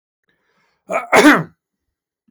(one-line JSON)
{"cough_length": "2.3 s", "cough_amplitude": 32766, "cough_signal_mean_std_ratio": 0.32, "survey_phase": "beta (2021-08-13 to 2022-03-07)", "age": "18-44", "gender": "Male", "wearing_mask": "No", "symptom_none": true, "smoker_status": "Never smoked", "respiratory_condition_asthma": false, "respiratory_condition_other": false, "recruitment_source": "REACT", "submission_delay": "0 days", "covid_test_result": "Negative", "covid_test_method": "RT-qPCR", "influenza_a_test_result": "Negative", "influenza_b_test_result": "Negative"}